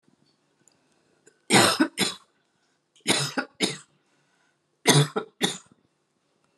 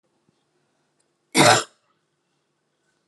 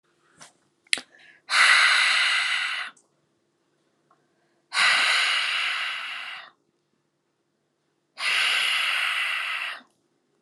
{"three_cough_length": "6.6 s", "three_cough_amplitude": 24551, "three_cough_signal_mean_std_ratio": 0.33, "cough_length": "3.1 s", "cough_amplitude": 25672, "cough_signal_mean_std_ratio": 0.23, "exhalation_length": "10.4 s", "exhalation_amplitude": 27698, "exhalation_signal_mean_std_ratio": 0.54, "survey_phase": "alpha (2021-03-01 to 2021-08-12)", "age": "45-64", "gender": "Female", "wearing_mask": "No", "symptom_none": true, "symptom_onset": "6 days", "smoker_status": "Never smoked", "respiratory_condition_asthma": true, "respiratory_condition_other": false, "recruitment_source": "REACT", "submission_delay": "1 day", "covid_test_result": "Negative", "covid_test_method": "RT-qPCR"}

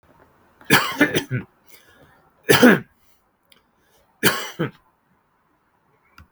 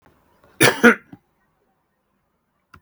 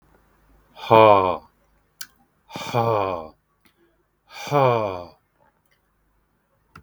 {"three_cough_length": "6.3 s", "three_cough_amplitude": 32766, "three_cough_signal_mean_std_ratio": 0.3, "cough_length": "2.8 s", "cough_amplitude": 32766, "cough_signal_mean_std_ratio": 0.23, "exhalation_length": "6.8 s", "exhalation_amplitude": 32766, "exhalation_signal_mean_std_ratio": 0.32, "survey_phase": "beta (2021-08-13 to 2022-03-07)", "age": "45-64", "gender": "Male", "wearing_mask": "No", "symptom_fatigue": true, "symptom_onset": "12 days", "smoker_status": "Never smoked", "respiratory_condition_asthma": false, "respiratory_condition_other": false, "recruitment_source": "REACT", "submission_delay": "1 day", "covid_test_result": "Negative", "covid_test_method": "RT-qPCR", "influenza_a_test_result": "Unknown/Void", "influenza_b_test_result": "Unknown/Void"}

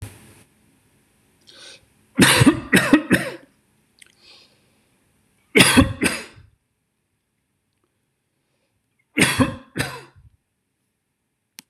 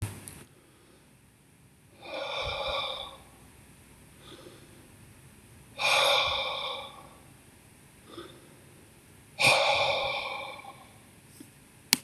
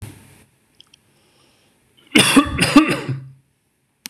{"three_cough_length": "11.7 s", "three_cough_amplitude": 26028, "three_cough_signal_mean_std_ratio": 0.3, "exhalation_length": "12.0 s", "exhalation_amplitude": 26028, "exhalation_signal_mean_std_ratio": 0.44, "cough_length": "4.1 s", "cough_amplitude": 26028, "cough_signal_mean_std_ratio": 0.35, "survey_phase": "beta (2021-08-13 to 2022-03-07)", "age": "45-64", "gender": "Male", "wearing_mask": "No", "symptom_none": true, "smoker_status": "Never smoked", "respiratory_condition_asthma": false, "respiratory_condition_other": false, "recruitment_source": "REACT", "submission_delay": "1 day", "covid_test_result": "Negative", "covid_test_method": "RT-qPCR", "influenza_a_test_result": "Unknown/Void", "influenza_b_test_result": "Unknown/Void"}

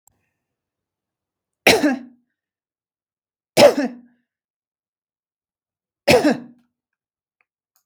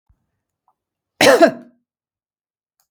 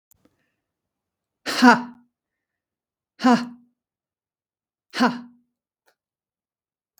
{"three_cough_length": "7.9 s", "three_cough_amplitude": 32768, "three_cough_signal_mean_std_ratio": 0.25, "cough_length": "2.9 s", "cough_amplitude": 32766, "cough_signal_mean_std_ratio": 0.26, "exhalation_length": "7.0 s", "exhalation_amplitude": 32766, "exhalation_signal_mean_std_ratio": 0.24, "survey_phase": "beta (2021-08-13 to 2022-03-07)", "age": "45-64", "gender": "Female", "wearing_mask": "No", "symptom_none": true, "smoker_status": "Never smoked", "respiratory_condition_asthma": false, "respiratory_condition_other": false, "recruitment_source": "REACT", "submission_delay": "1 day", "covid_test_result": "Negative", "covid_test_method": "RT-qPCR"}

